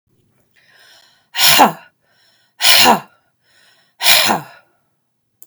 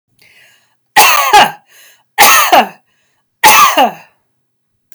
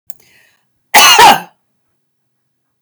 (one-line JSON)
{"exhalation_length": "5.5 s", "exhalation_amplitude": 32768, "exhalation_signal_mean_std_ratio": 0.37, "three_cough_length": "4.9 s", "three_cough_amplitude": 32768, "three_cough_signal_mean_std_ratio": 0.48, "cough_length": "2.8 s", "cough_amplitude": 32768, "cough_signal_mean_std_ratio": 0.36, "survey_phase": "beta (2021-08-13 to 2022-03-07)", "age": "45-64", "gender": "Female", "wearing_mask": "No", "symptom_none": true, "smoker_status": "Never smoked", "respiratory_condition_asthma": false, "respiratory_condition_other": false, "recruitment_source": "REACT", "submission_delay": "2 days", "covid_test_result": "Negative", "covid_test_method": "RT-qPCR", "influenza_a_test_result": "Negative", "influenza_b_test_result": "Negative"}